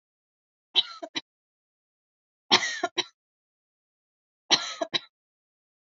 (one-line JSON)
{"three_cough_length": "6.0 s", "three_cough_amplitude": 21804, "three_cough_signal_mean_std_ratio": 0.24, "survey_phase": "alpha (2021-03-01 to 2021-08-12)", "age": "18-44", "gender": "Female", "wearing_mask": "No", "symptom_none": true, "smoker_status": "Never smoked", "respiratory_condition_asthma": true, "respiratory_condition_other": false, "recruitment_source": "REACT", "submission_delay": "1 day", "covid_test_result": "Negative", "covid_test_method": "RT-qPCR"}